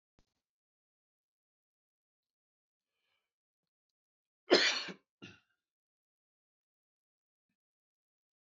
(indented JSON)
{
  "cough_length": "8.4 s",
  "cough_amplitude": 7883,
  "cough_signal_mean_std_ratio": 0.15,
  "survey_phase": "beta (2021-08-13 to 2022-03-07)",
  "age": "65+",
  "gender": "Male",
  "wearing_mask": "No",
  "symptom_none": true,
  "smoker_status": "Ex-smoker",
  "respiratory_condition_asthma": false,
  "respiratory_condition_other": false,
  "recruitment_source": "REACT",
  "submission_delay": "3 days",
  "covid_test_result": "Negative",
  "covid_test_method": "RT-qPCR",
  "influenza_a_test_result": "Negative",
  "influenza_b_test_result": "Negative"
}